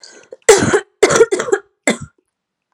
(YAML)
three_cough_length: 2.7 s
three_cough_amplitude: 32768
three_cough_signal_mean_std_ratio: 0.43
survey_phase: alpha (2021-03-01 to 2021-08-12)
age: 18-44
gender: Female
wearing_mask: 'No'
symptom_cough_any: true
symptom_new_continuous_cough: true
symptom_fatigue: true
symptom_fever_high_temperature: true
symptom_headache: true
symptom_change_to_sense_of_smell_or_taste: true
symptom_loss_of_taste: true
symptom_onset: 3 days
smoker_status: Never smoked
respiratory_condition_asthma: false
respiratory_condition_other: false
recruitment_source: Test and Trace
submission_delay: 2 days
covid_test_result: Positive
covid_test_method: RT-qPCR